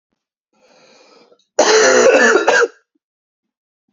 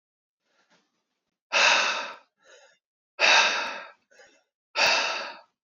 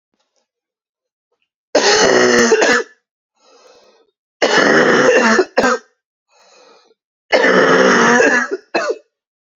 cough_length: 3.9 s
cough_amplitude: 31092
cough_signal_mean_std_ratio: 0.46
exhalation_length: 5.6 s
exhalation_amplitude: 15524
exhalation_signal_mean_std_ratio: 0.42
three_cough_length: 9.6 s
three_cough_amplitude: 32767
three_cough_signal_mean_std_ratio: 0.56
survey_phase: beta (2021-08-13 to 2022-03-07)
age: 18-44
gender: Male
wearing_mask: 'No'
symptom_cough_any: true
symptom_new_continuous_cough: true
symptom_runny_or_blocked_nose: true
symptom_shortness_of_breath: true
symptom_fatigue: true
symptom_fever_high_temperature: true
symptom_other: true
smoker_status: Never smoked
respiratory_condition_asthma: false
respiratory_condition_other: false
recruitment_source: Test and Trace
submission_delay: 1 day
covid_test_result: Positive
covid_test_method: RT-qPCR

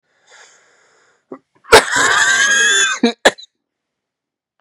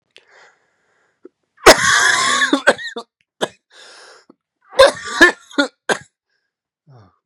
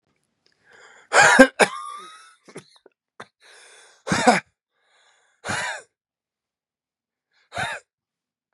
cough_length: 4.6 s
cough_amplitude: 32768
cough_signal_mean_std_ratio: 0.44
three_cough_length: 7.3 s
three_cough_amplitude: 32768
three_cough_signal_mean_std_ratio: 0.34
exhalation_length: 8.5 s
exhalation_amplitude: 32767
exhalation_signal_mean_std_ratio: 0.26
survey_phase: beta (2021-08-13 to 2022-03-07)
age: 45-64
gender: Male
wearing_mask: 'No'
symptom_new_continuous_cough: true
symptom_runny_or_blocked_nose: true
symptom_shortness_of_breath: true
symptom_fatigue: true
symptom_headache: true
symptom_change_to_sense_of_smell_or_taste: true
symptom_loss_of_taste: true
symptom_other: true
symptom_onset: 3 days
smoker_status: Never smoked
respiratory_condition_asthma: true
respiratory_condition_other: false
recruitment_source: Test and Trace
submission_delay: 1 day
covid_test_result: Positive
covid_test_method: LAMP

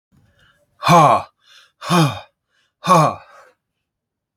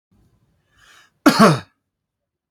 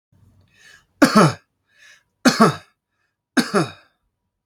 exhalation_length: 4.4 s
exhalation_amplitude: 32253
exhalation_signal_mean_std_ratio: 0.37
cough_length: 2.5 s
cough_amplitude: 28795
cough_signal_mean_std_ratio: 0.27
three_cough_length: 4.5 s
three_cough_amplitude: 31227
three_cough_signal_mean_std_ratio: 0.32
survey_phase: beta (2021-08-13 to 2022-03-07)
age: 18-44
gender: Male
wearing_mask: 'No'
symptom_none: true
smoker_status: Never smoked
respiratory_condition_asthma: false
respiratory_condition_other: false
recruitment_source: REACT
submission_delay: 2 days
covid_test_result: Negative
covid_test_method: RT-qPCR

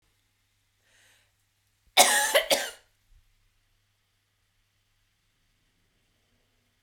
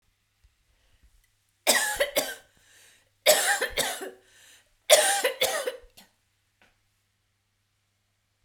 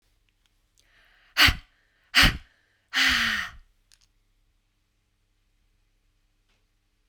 cough_length: 6.8 s
cough_amplitude: 26118
cough_signal_mean_std_ratio: 0.22
three_cough_length: 8.4 s
three_cough_amplitude: 23456
three_cough_signal_mean_std_ratio: 0.35
exhalation_length: 7.1 s
exhalation_amplitude: 22199
exhalation_signal_mean_std_ratio: 0.27
survey_phase: beta (2021-08-13 to 2022-03-07)
age: 45-64
gender: Female
wearing_mask: 'No'
symptom_none: true
smoker_status: Never smoked
respiratory_condition_asthma: false
respiratory_condition_other: false
recruitment_source: REACT
submission_delay: 1 day
covid_test_result: Negative
covid_test_method: RT-qPCR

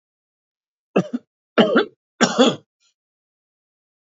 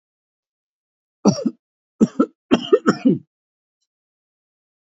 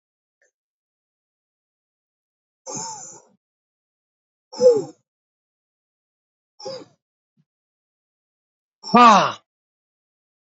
three_cough_length: 4.0 s
three_cough_amplitude: 27772
three_cough_signal_mean_std_ratio: 0.31
cough_length: 4.9 s
cough_amplitude: 27344
cough_signal_mean_std_ratio: 0.28
exhalation_length: 10.5 s
exhalation_amplitude: 27799
exhalation_signal_mean_std_ratio: 0.21
survey_phase: alpha (2021-03-01 to 2021-08-12)
age: 45-64
gender: Male
wearing_mask: 'No'
symptom_cough_any: true
symptom_shortness_of_breath: true
smoker_status: Never smoked
respiratory_condition_asthma: true
respiratory_condition_other: false
recruitment_source: Test and Trace
submission_delay: 1 day
covid_test_result: Positive
covid_test_method: RT-qPCR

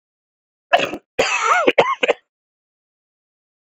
cough_length: 3.7 s
cough_amplitude: 31784
cough_signal_mean_std_ratio: 0.39
survey_phase: beta (2021-08-13 to 2022-03-07)
age: 18-44
gender: Male
wearing_mask: 'Yes'
symptom_cough_any: true
symptom_new_continuous_cough: true
symptom_runny_or_blocked_nose: true
symptom_shortness_of_breath: true
symptom_fever_high_temperature: true
symptom_headache: true
symptom_change_to_sense_of_smell_or_taste: true
symptom_loss_of_taste: true
symptom_onset: 4 days
smoker_status: Never smoked
respiratory_condition_asthma: false
respiratory_condition_other: false
recruitment_source: Test and Trace
submission_delay: 2 days
covid_test_result: Positive
covid_test_method: RT-qPCR
covid_ct_value: 16.6
covid_ct_gene: ORF1ab gene
covid_ct_mean: 17.0
covid_viral_load: 2600000 copies/ml
covid_viral_load_category: High viral load (>1M copies/ml)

